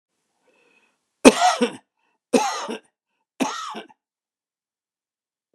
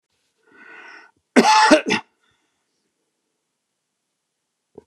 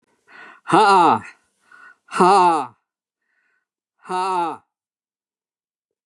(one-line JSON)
{"three_cough_length": "5.5 s", "three_cough_amplitude": 32768, "three_cough_signal_mean_std_ratio": 0.26, "cough_length": "4.9 s", "cough_amplitude": 32767, "cough_signal_mean_std_ratio": 0.27, "exhalation_length": "6.1 s", "exhalation_amplitude": 29387, "exhalation_signal_mean_std_ratio": 0.4, "survey_phase": "beta (2021-08-13 to 2022-03-07)", "age": "65+", "gender": "Male", "wearing_mask": "No", "symptom_none": true, "smoker_status": "Ex-smoker", "respiratory_condition_asthma": false, "respiratory_condition_other": false, "recruitment_source": "REACT", "submission_delay": "2 days", "covid_test_result": "Negative", "covid_test_method": "RT-qPCR", "influenza_a_test_result": "Negative", "influenza_b_test_result": "Negative"}